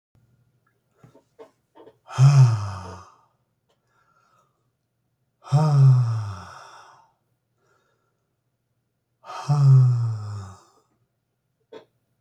exhalation_length: 12.2 s
exhalation_amplitude: 17896
exhalation_signal_mean_std_ratio: 0.36
survey_phase: beta (2021-08-13 to 2022-03-07)
age: 65+
gender: Male
wearing_mask: 'No'
symptom_none: true
smoker_status: Ex-smoker
respiratory_condition_asthma: false
respiratory_condition_other: false
recruitment_source: REACT
submission_delay: 2 days
covid_test_result: Negative
covid_test_method: RT-qPCR
influenza_a_test_result: Negative
influenza_b_test_result: Negative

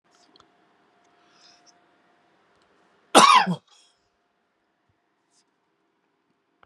cough_length: 6.7 s
cough_amplitude: 32140
cough_signal_mean_std_ratio: 0.19
survey_phase: beta (2021-08-13 to 2022-03-07)
age: 45-64
gender: Male
wearing_mask: 'No'
symptom_none: true
smoker_status: Ex-smoker
respiratory_condition_asthma: false
respiratory_condition_other: false
recruitment_source: REACT
submission_delay: 2 days
covid_test_result: Negative
covid_test_method: RT-qPCR
influenza_a_test_result: Negative
influenza_b_test_result: Negative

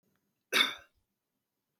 cough_length: 1.8 s
cough_amplitude: 8512
cough_signal_mean_std_ratio: 0.25
survey_phase: beta (2021-08-13 to 2022-03-07)
age: 45-64
gender: Male
wearing_mask: 'No'
symptom_none: true
smoker_status: Never smoked
respiratory_condition_asthma: false
respiratory_condition_other: false
recruitment_source: REACT
submission_delay: 1 day
covid_test_result: Negative
covid_test_method: RT-qPCR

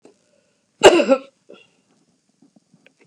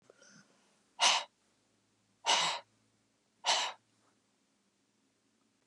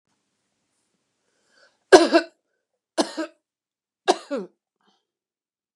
cough_length: 3.1 s
cough_amplitude: 32768
cough_signal_mean_std_ratio: 0.24
exhalation_length: 5.7 s
exhalation_amplitude: 7697
exhalation_signal_mean_std_ratio: 0.3
three_cough_length: 5.8 s
three_cough_amplitude: 32768
three_cough_signal_mean_std_ratio: 0.2
survey_phase: beta (2021-08-13 to 2022-03-07)
age: 65+
gender: Female
wearing_mask: 'No'
symptom_none: true
smoker_status: Never smoked
respiratory_condition_asthma: true
respiratory_condition_other: false
recruitment_source: REACT
submission_delay: 2 days
covid_test_result: Negative
covid_test_method: RT-qPCR
influenza_a_test_result: Negative
influenza_b_test_result: Negative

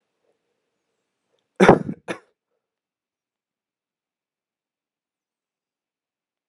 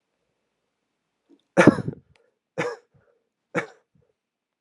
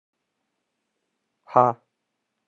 cough_length: 6.5 s
cough_amplitude: 32768
cough_signal_mean_std_ratio: 0.14
three_cough_length: 4.6 s
three_cough_amplitude: 32767
three_cough_signal_mean_std_ratio: 0.19
exhalation_length: 2.5 s
exhalation_amplitude: 26098
exhalation_signal_mean_std_ratio: 0.17
survey_phase: alpha (2021-03-01 to 2021-08-12)
age: 18-44
gender: Male
wearing_mask: 'No'
symptom_fatigue: true
symptom_fever_high_temperature: true
symptom_headache: true
symptom_onset: 3 days
smoker_status: Never smoked
respiratory_condition_asthma: false
respiratory_condition_other: false
recruitment_source: Test and Trace
submission_delay: 2 days
covid_test_result: Positive
covid_test_method: RT-qPCR
covid_ct_value: 33.2
covid_ct_gene: N gene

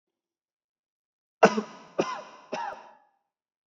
three_cough_length: 3.7 s
three_cough_amplitude: 22501
three_cough_signal_mean_std_ratio: 0.24
survey_phase: beta (2021-08-13 to 2022-03-07)
age: 18-44
gender: Male
wearing_mask: 'Yes'
symptom_none: true
smoker_status: Ex-smoker
respiratory_condition_asthma: false
respiratory_condition_other: false
recruitment_source: REACT
submission_delay: 1 day
covid_test_result: Negative
covid_test_method: RT-qPCR
influenza_a_test_result: Negative
influenza_b_test_result: Negative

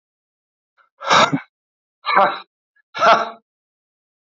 exhalation_length: 4.3 s
exhalation_amplitude: 27850
exhalation_signal_mean_std_ratio: 0.35
survey_phase: beta (2021-08-13 to 2022-03-07)
age: 45-64
gender: Male
wearing_mask: 'No'
symptom_diarrhoea: true
symptom_fatigue: true
symptom_fever_high_temperature: true
smoker_status: Never smoked
respiratory_condition_asthma: true
respiratory_condition_other: false
recruitment_source: Test and Trace
submission_delay: 2 days
covid_test_result: Positive
covid_test_method: RT-qPCR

